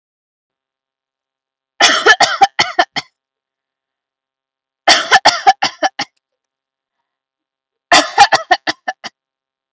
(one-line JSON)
{"three_cough_length": "9.7 s", "three_cough_amplitude": 32768, "three_cough_signal_mean_std_ratio": 0.32, "survey_phase": "beta (2021-08-13 to 2022-03-07)", "age": "18-44", "gender": "Female", "wearing_mask": "No", "symptom_none": true, "smoker_status": "Never smoked", "respiratory_condition_asthma": false, "respiratory_condition_other": false, "recruitment_source": "REACT", "submission_delay": "1 day", "covid_test_result": "Negative", "covid_test_method": "RT-qPCR"}